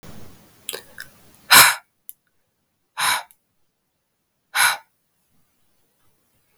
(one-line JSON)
{"exhalation_length": "6.6 s", "exhalation_amplitude": 32768, "exhalation_signal_mean_std_ratio": 0.24, "survey_phase": "beta (2021-08-13 to 2022-03-07)", "age": "18-44", "gender": "Female", "wearing_mask": "No", "symptom_cough_any": true, "symptom_runny_or_blocked_nose": true, "symptom_sore_throat": true, "symptom_fatigue": true, "symptom_change_to_sense_of_smell_or_taste": true, "smoker_status": "Never smoked", "respiratory_condition_asthma": false, "respiratory_condition_other": false, "recruitment_source": "Test and Trace", "submission_delay": "2 days", "covid_test_result": "Positive", "covid_test_method": "RT-qPCR"}